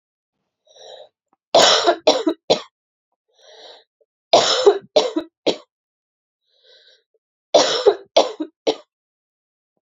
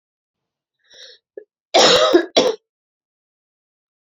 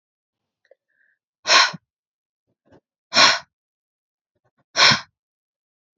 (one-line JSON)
{"three_cough_length": "9.8 s", "three_cough_amplitude": 31698, "three_cough_signal_mean_std_ratio": 0.35, "cough_length": "4.0 s", "cough_amplitude": 32386, "cough_signal_mean_std_ratio": 0.33, "exhalation_length": "6.0 s", "exhalation_amplitude": 30787, "exhalation_signal_mean_std_ratio": 0.26, "survey_phase": "beta (2021-08-13 to 2022-03-07)", "age": "18-44", "gender": "Female", "wearing_mask": "No", "symptom_cough_any": true, "symptom_runny_or_blocked_nose": true, "symptom_sore_throat": true, "symptom_fatigue": true, "symptom_headache": true, "smoker_status": "Never smoked", "respiratory_condition_asthma": false, "respiratory_condition_other": false, "recruitment_source": "Test and Trace", "submission_delay": "1 day", "covid_test_result": "Positive", "covid_test_method": "RT-qPCR"}